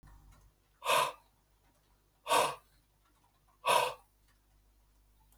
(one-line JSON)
{"exhalation_length": "5.4 s", "exhalation_amplitude": 5630, "exhalation_signal_mean_std_ratio": 0.32, "survey_phase": "beta (2021-08-13 to 2022-03-07)", "age": "45-64", "gender": "Male", "wearing_mask": "No", "symptom_none": true, "smoker_status": "Ex-smoker", "respiratory_condition_asthma": false, "respiratory_condition_other": false, "recruitment_source": "REACT", "submission_delay": "3 days", "covid_test_result": "Negative", "covid_test_method": "RT-qPCR", "influenza_a_test_result": "Negative", "influenza_b_test_result": "Negative"}